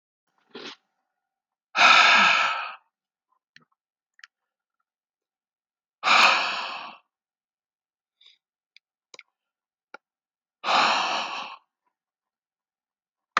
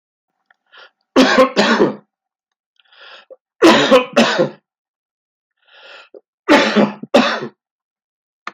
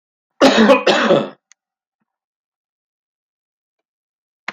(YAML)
exhalation_length: 13.4 s
exhalation_amplitude: 25105
exhalation_signal_mean_std_ratio: 0.31
three_cough_length: 8.5 s
three_cough_amplitude: 30960
three_cough_signal_mean_std_ratio: 0.41
cough_length: 4.5 s
cough_amplitude: 29524
cough_signal_mean_std_ratio: 0.33
survey_phase: beta (2021-08-13 to 2022-03-07)
age: 65+
gender: Male
wearing_mask: 'No'
symptom_cough_any: true
symptom_other: true
symptom_onset: 5 days
smoker_status: Ex-smoker
respiratory_condition_asthma: false
respiratory_condition_other: false
recruitment_source: Test and Trace
submission_delay: 3 days
covid_test_result: Positive
covid_test_method: RT-qPCR
covid_ct_value: 18.7
covid_ct_gene: ORF1ab gene